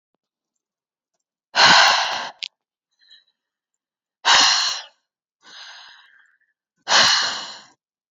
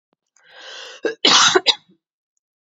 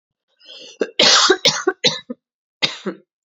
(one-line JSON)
{"exhalation_length": "8.1 s", "exhalation_amplitude": 30297, "exhalation_signal_mean_std_ratio": 0.36, "cough_length": "2.7 s", "cough_amplitude": 30778, "cough_signal_mean_std_ratio": 0.35, "three_cough_length": "3.2 s", "three_cough_amplitude": 31977, "three_cough_signal_mean_std_ratio": 0.42, "survey_phase": "beta (2021-08-13 to 2022-03-07)", "age": "18-44", "gender": "Female", "wearing_mask": "No", "symptom_other": true, "symptom_onset": "12 days", "smoker_status": "Ex-smoker", "respiratory_condition_asthma": false, "respiratory_condition_other": false, "recruitment_source": "REACT", "submission_delay": "0 days", "covid_test_result": "Negative", "covid_test_method": "RT-qPCR", "influenza_a_test_result": "Negative", "influenza_b_test_result": "Negative"}